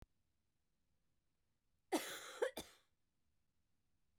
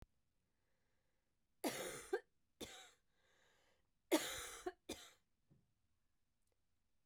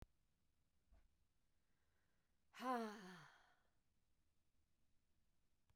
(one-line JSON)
{"cough_length": "4.2 s", "cough_amplitude": 1899, "cough_signal_mean_std_ratio": 0.26, "three_cough_length": "7.1 s", "three_cough_amplitude": 2961, "three_cough_signal_mean_std_ratio": 0.29, "exhalation_length": "5.8 s", "exhalation_amplitude": 686, "exhalation_signal_mean_std_ratio": 0.28, "survey_phase": "beta (2021-08-13 to 2022-03-07)", "age": "45-64", "gender": "Female", "wearing_mask": "No", "symptom_none": true, "smoker_status": "Ex-smoker", "respiratory_condition_asthma": false, "respiratory_condition_other": false, "recruitment_source": "REACT", "submission_delay": "3 days", "covid_test_result": "Negative", "covid_test_method": "RT-qPCR"}